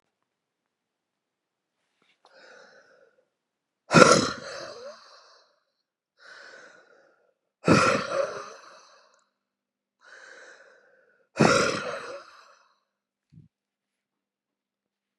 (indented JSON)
{
  "exhalation_length": "15.2 s",
  "exhalation_amplitude": 32768,
  "exhalation_signal_mean_std_ratio": 0.25,
  "survey_phase": "beta (2021-08-13 to 2022-03-07)",
  "age": "18-44",
  "gender": "Female",
  "wearing_mask": "No",
  "symptom_new_continuous_cough": true,
  "symptom_runny_or_blocked_nose": true,
  "symptom_fatigue": true,
  "symptom_change_to_sense_of_smell_or_taste": true,
  "symptom_other": true,
  "smoker_status": "Ex-smoker",
  "respiratory_condition_asthma": false,
  "respiratory_condition_other": false,
  "recruitment_source": "Test and Trace",
  "submission_delay": "3 days",
  "covid_test_result": "Positive",
  "covid_test_method": "RT-qPCR",
  "covid_ct_value": 23.3,
  "covid_ct_gene": "ORF1ab gene",
  "covid_ct_mean": 24.0,
  "covid_viral_load": "13000 copies/ml",
  "covid_viral_load_category": "Low viral load (10K-1M copies/ml)"
}